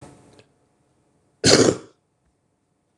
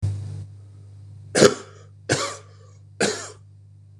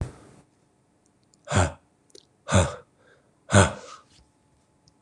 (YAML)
cough_length: 3.0 s
cough_amplitude: 26027
cough_signal_mean_std_ratio: 0.26
three_cough_length: 4.0 s
three_cough_amplitude: 26028
three_cough_signal_mean_std_ratio: 0.39
exhalation_length: 5.0 s
exhalation_amplitude: 24133
exhalation_signal_mean_std_ratio: 0.28
survey_phase: beta (2021-08-13 to 2022-03-07)
age: 18-44
gender: Male
wearing_mask: 'No'
symptom_cough_any: true
symptom_runny_or_blocked_nose: true
symptom_shortness_of_breath: true
symptom_sore_throat: true
symptom_headache: true
symptom_onset: 3 days
smoker_status: Current smoker (1 to 10 cigarettes per day)
respiratory_condition_asthma: false
respiratory_condition_other: false
recruitment_source: Test and Trace
submission_delay: 2 days
covid_test_result: Positive
covid_test_method: RT-qPCR
covid_ct_value: 27.0
covid_ct_gene: ORF1ab gene
covid_ct_mean: 27.7
covid_viral_load: 830 copies/ml
covid_viral_load_category: Minimal viral load (< 10K copies/ml)